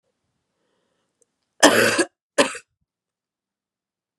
{"cough_length": "4.2 s", "cough_amplitude": 32768, "cough_signal_mean_std_ratio": 0.26, "survey_phase": "beta (2021-08-13 to 2022-03-07)", "age": "45-64", "gender": "Female", "wearing_mask": "No", "symptom_cough_any": true, "symptom_runny_or_blocked_nose": true, "symptom_diarrhoea": true, "symptom_onset": "4 days", "smoker_status": "Never smoked", "respiratory_condition_asthma": false, "respiratory_condition_other": false, "recruitment_source": "Test and Trace", "submission_delay": "2 days", "covid_test_result": "Positive", "covid_test_method": "RT-qPCR", "covid_ct_value": 22.2, "covid_ct_gene": "N gene"}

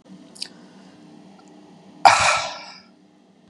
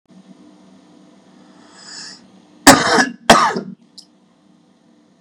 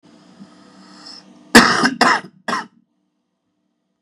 {"exhalation_length": "3.5 s", "exhalation_amplitude": 32768, "exhalation_signal_mean_std_ratio": 0.3, "three_cough_length": "5.2 s", "three_cough_amplitude": 32768, "three_cough_signal_mean_std_ratio": 0.29, "cough_length": "4.0 s", "cough_amplitude": 32768, "cough_signal_mean_std_ratio": 0.32, "survey_phase": "beta (2021-08-13 to 2022-03-07)", "age": "18-44", "gender": "Male", "wearing_mask": "No", "symptom_none": true, "smoker_status": "Current smoker (11 or more cigarettes per day)", "respiratory_condition_asthma": false, "respiratory_condition_other": false, "recruitment_source": "REACT", "submission_delay": "0 days", "covid_test_method": "RT-qPCR", "covid_ct_value": 36.4, "covid_ct_gene": "E gene", "influenza_a_test_result": "Unknown/Void", "influenza_b_test_result": "Unknown/Void"}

